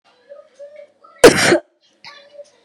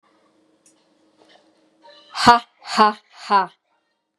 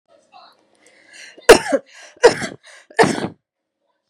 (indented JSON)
{
  "cough_length": "2.6 s",
  "cough_amplitude": 32768,
  "cough_signal_mean_std_ratio": 0.28,
  "exhalation_length": "4.2 s",
  "exhalation_amplitude": 32768,
  "exhalation_signal_mean_std_ratio": 0.28,
  "three_cough_length": "4.1 s",
  "three_cough_amplitude": 32768,
  "three_cough_signal_mean_std_ratio": 0.27,
  "survey_phase": "beta (2021-08-13 to 2022-03-07)",
  "age": "18-44",
  "gender": "Female",
  "wearing_mask": "No",
  "symptom_none": true,
  "smoker_status": "Never smoked",
  "respiratory_condition_asthma": false,
  "respiratory_condition_other": false,
  "recruitment_source": "REACT",
  "submission_delay": "5 days",
  "covid_test_result": "Negative",
  "covid_test_method": "RT-qPCR",
  "influenza_a_test_result": "Negative",
  "influenza_b_test_result": "Negative"
}